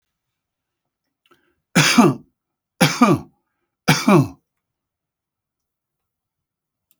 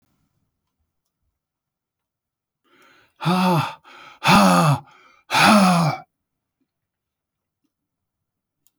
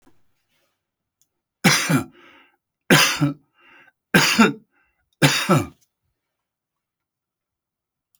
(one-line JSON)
{"three_cough_length": "7.0 s", "three_cough_amplitude": 30764, "three_cough_signal_mean_std_ratio": 0.3, "exhalation_length": "8.8 s", "exhalation_amplitude": 27406, "exhalation_signal_mean_std_ratio": 0.36, "cough_length": "8.2 s", "cough_amplitude": 32382, "cough_signal_mean_std_ratio": 0.33, "survey_phase": "alpha (2021-03-01 to 2021-08-12)", "age": "65+", "gender": "Male", "wearing_mask": "No", "symptom_none": true, "smoker_status": "Ex-smoker", "respiratory_condition_asthma": false, "respiratory_condition_other": false, "recruitment_source": "REACT", "submission_delay": "4 days", "covid_test_result": "Negative", "covid_test_method": "RT-qPCR"}